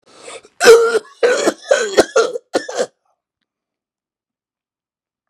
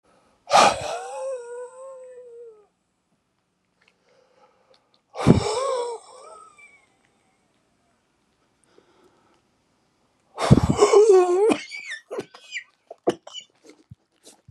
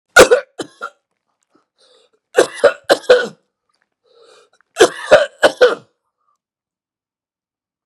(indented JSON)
{
  "cough_length": "5.3 s",
  "cough_amplitude": 32768,
  "cough_signal_mean_std_ratio": 0.38,
  "exhalation_length": "14.5 s",
  "exhalation_amplitude": 32768,
  "exhalation_signal_mean_std_ratio": 0.33,
  "three_cough_length": "7.9 s",
  "three_cough_amplitude": 32768,
  "three_cough_signal_mean_std_ratio": 0.29,
  "survey_phase": "beta (2021-08-13 to 2022-03-07)",
  "age": "65+",
  "gender": "Male",
  "wearing_mask": "No",
  "symptom_none": true,
  "smoker_status": "Ex-smoker",
  "respiratory_condition_asthma": true,
  "respiratory_condition_other": true,
  "recruitment_source": "REACT",
  "submission_delay": "2 days",
  "covid_test_result": "Negative",
  "covid_test_method": "RT-qPCR",
  "influenza_a_test_result": "Negative",
  "influenza_b_test_result": "Negative"
}